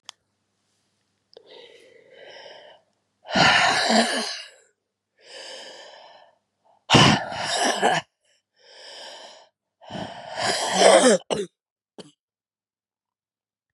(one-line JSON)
{"exhalation_length": "13.7 s", "exhalation_amplitude": 28129, "exhalation_signal_mean_std_ratio": 0.37, "survey_phase": "beta (2021-08-13 to 2022-03-07)", "age": "45-64", "gender": "Female", "wearing_mask": "No", "symptom_cough_any": true, "symptom_new_continuous_cough": true, "symptom_runny_or_blocked_nose": true, "symptom_abdominal_pain": true, "symptom_fatigue": true, "symptom_headache": true, "symptom_change_to_sense_of_smell_or_taste": true, "symptom_onset": "2 days", "smoker_status": "Never smoked", "respiratory_condition_asthma": true, "respiratory_condition_other": false, "recruitment_source": "Test and Trace", "submission_delay": "1 day", "covid_test_result": "Positive", "covid_test_method": "RT-qPCR", "covid_ct_value": 16.2, "covid_ct_gene": "N gene", "covid_ct_mean": 16.2, "covid_viral_load": "5000000 copies/ml", "covid_viral_load_category": "High viral load (>1M copies/ml)"}